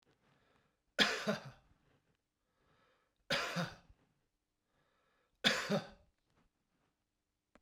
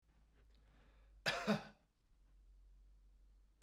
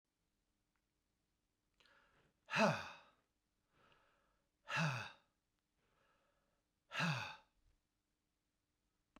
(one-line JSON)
{"three_cough_length": "7.6 s", "three_cough_amplitude": 6887, "three_cough_signal_mean_std_ratio": 0.29, "cough_length": "3.6 s", "cough_amplitude": 2319, "cough_signal_mean_std_ratio": 0.31, "exhalation_length": "9.2 s", "exhalation_amplitude": 2835, "exhalation_signal_mean_std_ratio": 0.27, "survey_phase": "beta (2021-08-13 to 2022-03-07)", "age": "45-64", "gender": "Male", "wearing_mask": "No", "symptom_cough_any": true, "symptom_sore_throat": true, "symptom_fatigue": true, "symptom_headache": true, "symptom_change_to_sense_of_smell_or_taste": true, "symptom_loss_of_taste": true, "symptom_onset": "6 days", "smoker_status": "Ex-smoker", "respiratory_condition_asthma": false, "respiratory_condition_other": false, "recruitment_source": "Test and Trace", "submission_delay": "2 days", "covid_test_result": "Positive", "covid_test_method": "RT-qPCR", "covid_ct_value": 22.2, "covid_ct_gene": "ORF1ab gene", "covid_ct_mean": 23.4, "covid_viral_load": "20000 copies/ml", "covid_viral_load_category": "Low viral load (10K-1M copies/ml)"}